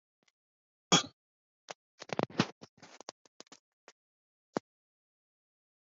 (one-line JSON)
{"cough_length": "5.8 s", "cough_amplitude": 9189, "cough_signal_mean_std_ratio": 0.16, "survey_phase": "alpha (2021-03-01 to 2021-08-12)", "age": "65+", "gender": "Male", "wearing_mask": "No", "symptom_none": true, "smoker_status": "Never smoked", "respiratory_condition_asthma": false, "respiratory_condition_other": false, "recruitment_source": "REACT", "submission_delay": "3 days", "covid_test_result": "Negative", "covid_test_method": "RT-qPCR"}